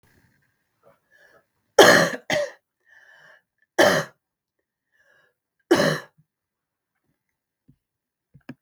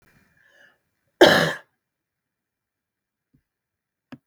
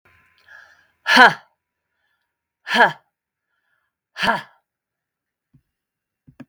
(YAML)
three_cough_length: 8.6 s
three_cough_amplitude: 32767
three_cough_signal_mean_std_ratio: 0.25
cough_length: 4.3 s
cough_amplitude: 32768
cough_signal_mean_std_ratio: 0.2
exhalation_length: 6.5 s
exhalation_amplitude: 32768
exhalation_signal_mean_std_ratio: 0.23
survey_phase: beta (2021-08-13 to 2022-03-07)
age: 45-64
gender: Female
wearing_mask: 'No'
symptom_cough_any: true
symptom_runny_or_blocked_nose: true
symptom_sore_throat: true
symptom_abdominal_pain: true
symptom_fatigue: true
symptom_headache: true
symptom_other: true
symptom_onset: 3 days
smoker_status: Never smoked
respiratory_condition_asthma: false
respiratory_condition_other: false
recruitment_source: Test and Trace
submission_delay: 1 day
covid_test_result: Positive
covid_test_method: RT-qPCR
covid_ct_value: 20.6
covid_ct_gene: N gene